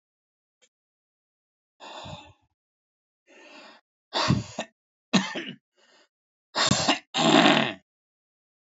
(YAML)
exhalation_length: 8.8 s
exhalation_amplitude: 26244
exhalation_signal_mean_std_ratio: 0.32
survey_phase: alpha (2021-03-01 to 2021-08-12)
age: 45-64
gender: Male
wearing_mask: 'No'
symptom_cough_any: true
symptom_fatigue: true
symptom_onset: 13 days
smoker_status: Ex-smoker
respiratory_condition_asthma: true
respiratory_condition_other: true
recruitment_source: Test and Trace
submission_delay: 2 days
covid_test_result: Positive
covid_test_method: RT-qPCR
covid_ct_value: 27.4
covid_ct_gene: N gene
covid_ct_mean: 27.5
covid_viral_load: 950 copies/ml
covid_viral_load_category: Minimal viral load (< 10K copies/ml)